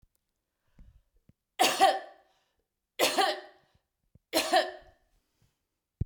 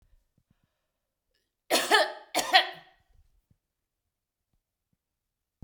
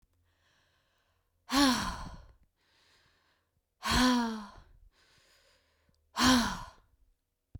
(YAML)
three_cough_length: 6.1 s
three_cough_amplitude: 9445
three_cough_signal_mean_std_ratio: 0.34
cough_length: 5.6 s
cough_amplitude: 27467
cough_signal_mean_std_ratio: 0.25
exhalation_length: 7.6 s
exhalation_amplitude: 7809
exhalation_signal_mean_std_ratio: 0.36
survey_phase: beta (2021-08-13 to 2022-03-07)
age: 45-64
gender: Female
wearing_mask: 'No'
symptom_none: true
smoker_status: Ex-smoker
respiratory_condition_asthma: false
respiratory_condition_other: false
recruitment_source: REACT
submission_delay: 1 day
covid_test_result: Negative
covid_test_method: RT-qPCR
influenza_a_test_result: Negative
influenza_b_test_result: Negative